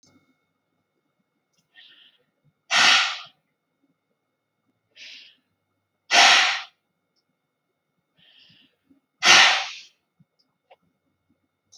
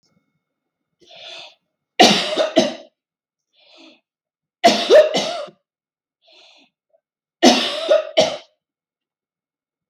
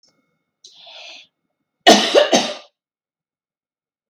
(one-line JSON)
{"exhalation_length": "11.8 s", "exhalation_amplitude": 30215, "exhalation_signal_mean_std_ratio": 0.26, "three_cough_length": "9.9 s", "three_cough_amplitude": 32768, "three_cough_signal_mean_std_ratio": 0.34, "cough_length": "4.1 s", "cough_amplitude": 32768, "cough_signal_mean_std_ratio": 0.29, "survey_phase": "beta (2021-08-13 to 2022-03-07)", "age": "45-64", "gender": "Female", "wearing_mask": "No", "symptom_none": true, "smoker_status": "Never smoked", "respiratory_condition_asthma": false, "respiratory_condition_other": false, "recruitment_source": "REACT", "submission_delay": "5 days", "covid_test_result": "Negative", "covid_test_method": "RT-qPCR"}